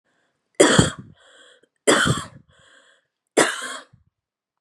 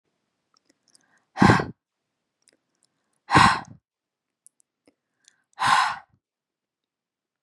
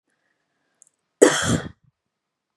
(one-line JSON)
{"three_cough_length": "4.6 s", "three_cough_amplitude": 32767, "three_cough_signal_mean_std_ratio": 0.34, "exhalation_length": "7.4 s", "exhalation_amplitude": 28136, "exhalation_signal_mean_std_ratio": 0.25, "cough_length": "2.6 s", "cough_amplitude": 32768, "cough_signal_mean_std_ratio": 0.26, "survey_phase": "beta (2021-08-13 to 2022-03-07)", "age": "18-44", "gender": "Female", "wearing_mask": "No", "symptom_headache": true, "smoker_status": "Never smoked", "respiratory_condition_asthma": false, "respiratory_condition_other": false, "recruitment_source": "REACT", "submission_delay": "1 day", "covid_test_result": "Negative", "covid_test_method": "RT-qPCR", "influenza_a_test_result": "Negative", "influenza_b_test_result": "Negative"}